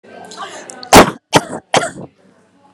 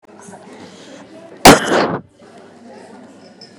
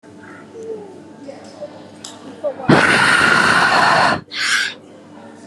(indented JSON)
{
  "three_cough_length": "2.7 s",
  "three_cough_amplitude": 32768,
  "three_cough_signal_mean_std_ratio": 0.33,
  "cough_length": "3.6 s",
  "cough_amplitude": 32768,
  "cough_signal_mean_std_ratio": 0.3,
  "exhalation_length": "5.5 s",
  "exhalation_amplitude": 32765,
  "exhalation_signal_mean_std_ratio": 0.6,
  "survey_phase": "beta (2021-08-13 to 2022-03-07)",
  "age": "18-44",
  "gender": "Female",
  "wearing_mask": "No",
  "symptom_none": true,
  "smoker_status": "Never smoked",
  "respiratory_condition_asthma": false,
  "respiratory_condition_other": false,
  "recruitment_source": "REACT",
  "submission_delay": "1 day",
  "covid_test_result": "Negative",
  "covid_test_method": "RT-qPCR"
}